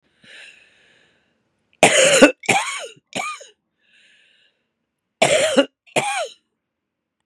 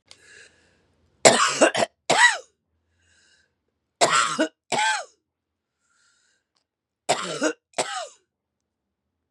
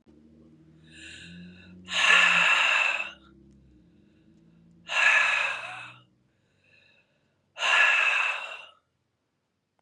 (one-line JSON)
{"cough_length": "7.3 s", "cough_amplitude": 32768, "cough_signal_mean_std_ratio": 0.35, "three_cough_length": "9.3 s", "three_cough_amplitude": 32767, "three_cough_signal_mean_std_ratio": 0.34, "exhalation_length": "9.8 s", "exhalation_amplitude": 14901, "exhalation_signal_mean_std_ratio": 0.46, "survey_phase": "beta (2021-08-13 to 2022-03-07)", "age": "65+", "gender": "Female", "wearing_mask": "No", "symptom_cough_any": true, "symptom_runny_or_blocked_nose": true, "symptom_fatigue": true, "symptom_onset": "5 days", "smoker_status": "Never smoked", "respiratory_condition_asthma": false, "respiratory_condition_other": false, "recruitment_source": "Test and Trace", "submission_delay": "1 day", "covid_test_result": "Positive", "covid_test_method": "RT-qPCR", "covid_ct_value": 20.4, "covid_ct_gene": "ORF1ab gene"}